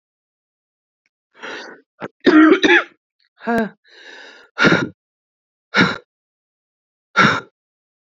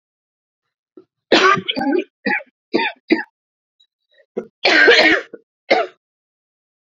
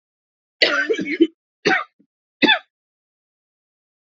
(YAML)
exhalation_length: 8.2 s
exhalation_amplitude: 30180
exhalation_signal_mean_std_ratio: 0.34
three_cough_length: 7.0 s
three_cough_amplitude: 29186
three_cough_signal_mean_std_ratio: 0.4
cough_length: 4.1 s
cough_amplitude: 30065
cough_signal_mean_std_ratio: 0.35
survey_phase: beta (2021-08-13 to 2022-03-07)
age: 45-64
gender: Female
wearing_mask: 'No'
symptom_cough_any: true
symptom_new_continuous_cough: true
symptom_runny_or_blocked_nose: true
symptom_shortness_of_breath: true
symptom_sore_throat: true
symptom_diarrhoea: true
symptom_fatigue: true
symptom_headache: true
symptom_change_to_sense_of_smell_or_taste: true
symptom_other: true
symptom_onset: 6 days
smoker_status: Ex-smoker
respiratory_condition_asthma: true
respiratory_condition_other: false
recruitment_source: Test and Trace
submission_delay: 1 day
covid_test_result: Positive
covid_test_method: RT-qPCR
covid_ct_value: 17.5
covid_ct_gene: ORF1ab gene
covid_ct_mean: 17.9
covid_viral_load: 1300000 copies/ml
covid_viral_load_category: High viral load (>1M copies/ml)